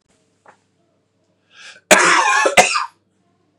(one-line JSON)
{"cough_length": "3.6 s", "cough_amplitude": 32768, "cough_signal_mean_std_ratio": 0.39, "survey_phase": "beta (2021-08-13 to 2022-03-07)", "age": "18-44", "gender": "Male", "wearing_mask": "No", "symptom_none": true, "smoker_status": "Never smoked", "respiratory_condition_asthma": false, "respiratory_condition_other": false, "recruitment_source": "REACT", "submission_delay": "1 day", "covid_test_result": "Negative", "covid_test_method": "RT-qPCR", "influenza_a_test_result": "Negative", "influenza_b_test_result": "Negative"}